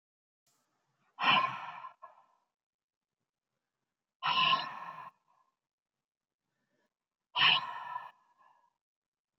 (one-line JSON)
{"exhalation_length": "9.4 s", "exhalation_amplitude": 6705, "exhalation_signal_mean_std_ratio": 0.31, "survey_phase": "beta (2021-08-13 to 2022-03-07)", "age": "18-44", "gender": "Female", "wearing_mask": "No", "symptom_none": true, "smoker_status": "Ex-smoker", "respiratory_condition_asthma": false, "respiratory_condition_other": false, "recruitment_source": "REACT", "submission_delay": "1 day", "covid_test_result": "Negative", "covid_test_method": "RT-qPCR", "influenza_a_test_result": "Negative", "influenza_b_test_result": "Negative"}